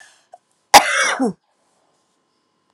cough_length: 2.7 s
cough_amplitude: 32768
cough_signal_mean_std_ratio: 0.29
survey_phase: alpha (2021-03-01 to 2021-08-12)
age: 45-64
gender: Female
wearing_mask: 'No'
symptom_cough_any: true
symptom_headache: true
symptom_onset: 6 days
smoker_status: Ex-smoker
respiratory_condition_asthma: true
respiratory_condition_other: false
recruitment_source: Test and Trace
submission_delay: 2 days
covid_test_result: Positive
covid_test_method: RT-qPCR
covid_ct_value: 15.0
covid_ct_gene: N gene
covid_ct_mean: 15.0
covid_viral_load: 12000000 copies/ml
covid_viral_load_category: High viral load (>1M copies/ml)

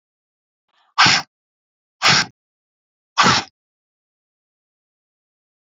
exhalation_length: 5.6 s
exhalation_amplitude: 32365
exhalation_signal_mean_std_ratio: 0.28
survey_phase: beta (2021-08-13 to 2022-03-07)
age: 18-44
gender: Female
wearing_mask: 'No'
symptom_none: true
smoker_status: Never smoked
respiratory_condition_asthma: false
respiratory_condition_other: false
recruitment_source: REACT
submission_delay: 2 days
covid_test_result: Negative
covid_test_method: RT-qPCR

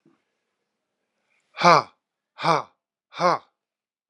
exhalation_length: 4.1 s
exhalation_amplitude: 30571
exhalation_signal_mean_std_ratio: 0.25
survey_phase: beta (2021-08-13 to 2022-03-07)
age: 65+
gender: Male
wearing_mask: 'No'
symptom_cough_any: true
symptom_runny_or_blocked_nose: true
symptom_sore_throat: true
symptom_fatigue: true
symptom_headache: true
symptom_onset: 4 days
smoker_status: Never smoked
respiratory_condition_asthma: false
respiratory_condition_other: false
recruitment_source: Test and Trace
submission_delay: 1 day
covid_test_result: Positive
covid_test_method: RT-qPCR
covid_ct_value: 13.5
covid_ct_gene: ORF1ab gene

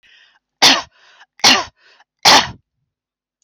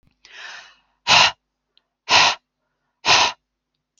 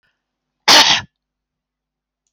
three_cough_length: 3.4 s
three_cough_amplitude: 31887
three_cough_signal_mean_std_ratio: 0.34
exhalation_length: 4.0 s
exhalation_amplitude: 31228
exhalation_signal_mean_std_ratio: 0.35
cough_length: 2.3 s
cough_amplitude: 31025
cough_signal_mean_std_ratio: 0.3
survey_phase: alpha (2021-03-01 to 2021-08-12)
age: 45-64
gender: Female
wearing_mask: 'No'
symptom_none: true
smoker_status: Ex-smoker
respiratory_condition_asthma: false
respiratory_condition_other: false
recruitment_source: REACT
submission_delay: 6 days
covid_test_result: Negative
covid_test_method: RT-qPCR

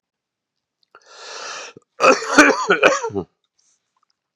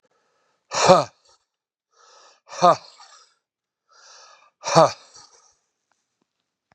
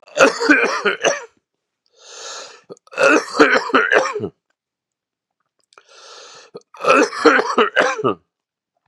cough_length: 4.4 s
cough_amplitude: 32768
cough_signal_mean_std_ratio: 0.36
exhalation_length: 6.7 s
exhalation_amplitude: 32767
exhalation_signal_mean_std_ratio: 0.23
three_cough_length: 8.9 s
three_cough_amplitude: 32768
three_cough_signal_mean_std_ratio: 0.46
survey_phase: beta (2021-08-13 to 2022-03-07)
age: 45-64
gender: Male
wearing_mask: 'No'
symptom_cough_any: true
symptom_runny_or_blocked_nose: true
symptom_sore_throat: true
symptom_fatigue: true
symptom_fever_high_temperature: true
symptom_headache: true
symptom_onset: 4 days
smoker_status: Never smoked
respiratory_condition_asthma: false
respiratory_condition_other: false
recruitment_source: Test and Trace
submission_delay: 1 day
covid_test_result: Positive
covid_test_method: ePCR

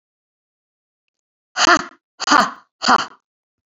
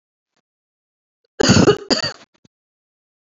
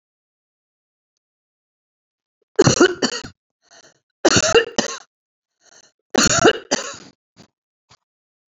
exhalation_length: 3.7 s
exhalation_amplitude: 29328
exhalation_signal_mean_std_ratio: 0.31
cough_length: 3.3 s
cough_amplitude: 30268
cough_signal_mean_std_ratio: 0.3
three_cough_length: 8.5 s
three_cough_amplitude: 31585
three_cough_signal_mean_std_ratio: 0.3
survey_phase: beta (2021-08-13 to 2022-03-07)
age: 45-64
gender: Female
wearing_mask: 'No'
symptom_none: true
smoker_status: Never smoked
respiratory_condition_asthma: true
respiratory_condition_other: false
recruitment_source: REACT
submission_delay: 8 days
covid_test_result: Negative
covid_test_method: RT-qPCR
influenza_a_test_result: Negative
influenza_b_test_result: Negative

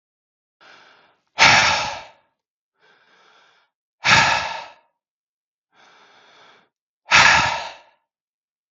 exhalation_length: 8.7 s
exhalation_amplitude: 32768
exhalation_signal_mean_std_ratio: 0.33
survey_phase: beta (2021-08-13 to 2022-03-07)
age: 45-64
gender: Male
wearing_mask: 'No'
symptom_none: true
smoker_status: Ex-smoker
respiratory_condition_asthma: false
respiratory_condition_other: false
recruitment_source: REACT
submission_delay: 1 day
covid_test_result: Negative
covid_test_method: RT-qPCR
influenza_a_test_result: Negative
influenza_b_test_result: Negative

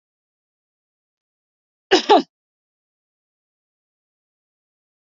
cough_length: 5.0 s
cough_amplitude: 28117
cough_signal_mean_std_ratio: 0.16
survey_phase: beta (2021-08-13 to 2022-03-07)
age: 45-64
gender: Female
wearing_mask: 'No'
symptom_abdominal_pain: true
symptom_fatigue: true
symptom_headache: true
symptom_onset: 8 days
smoker_status: Ex-smoker
respiratory_condition_asthma: false
respiratory_condition_other: false
recruitment_source: REACT
submission_delay: 1 day
covid_test_result: Negative
covid_test_method: RT-qPCR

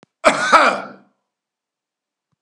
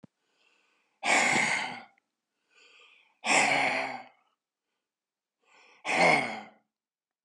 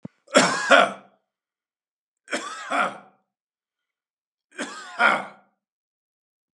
cough_length: 2.4 s
cough_amplitude: 32768
cough_signal_mean_std_ratio: 0.35
exhalation_length: 7.2 s
exhalation_amplitude: 10395
exhalation_signal_mean_std_ratio: 0.41
three_cough_length: 6.6 s
three_cough_amplitude: 31358
three_cough_signal_mean_std_ratio: 0.31
survey_phase: beta (2021-08-13 to 2022-03-07)
age: 65+
gender: Male
wearing_mask: 'No'
symptom_none: true
smoker_status: Ex-smoker
respiratory_condition_asthma: false
respiratory_condition_other: false
recruitment_source: REACT
submission_delay: 3 days
covid_test_result: Negative
covid_test_method: RT-qPCR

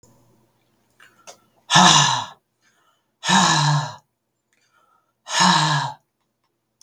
exhalation_length: 6.8 s
exhalation_amplitude: 32768
exhalation_signal_mean_std_ratio: 0.41
survey_phase: beta (2021-08-13 to 2022-03-07)
age: 18-44
gender: Male
wearing_mask: 'No'
symptom_cough_any: true
symptom_new_continuous_cough: true
symptom_runny_or_blocked_nose: true
symptom_sore_throat: true
symptom_fatigue: true
symptom_fever_high_temperature: true
symptom_headache: true
smoker_status: Never smoked
respiratory_condition_asthma: false
respiratory_condition_other: false
recruitment_source: REACT
submission_delay: 3 days
covid_test_result: Negative
covid_test_method: RT-qPCR
influenza_a_test_result: Negative
influenza_b_test_result: Negative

